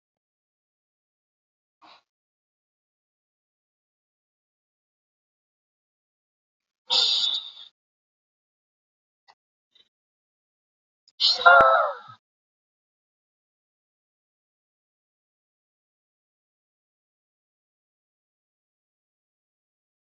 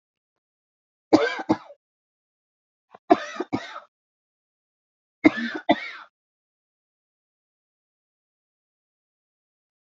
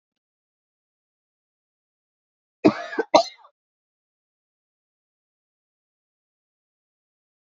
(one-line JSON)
{"exhalation_length": "20.1 s", "exhalation_amplitude": 25217, "exhalation_signal_mean_std_ratio": 0.17, "three_cough_length": "9.9 s", "three_cough_amplitude": 26874, "three_cough_signal_mean_std_ratio": 0.2, "cough_length": "7.4 s", "cough_amplitude": 28440, "cough_signal_mean_std_ratio": 0.14, "survey_phase": "beta (2021-08-13 to 2022-03-07)", "age": "65+", "gender": "Female", "wearing_mask": "No", "symptom_cough_any": true, "symptom_shortness_of_breath": true, "symptom_fatigue": true, "smoker_status": "Never smoked", "respiratory_condition_asthma": false, "respiratory_condition_other": true, "recruitment_source": "REACT", "submission_delay": "2 days", "covid_test_result": "Negative", "covid_test_method": "RT-qPCR", "influenza_a_test_result": "Negative", "influenza_b_test_result": "Negative"}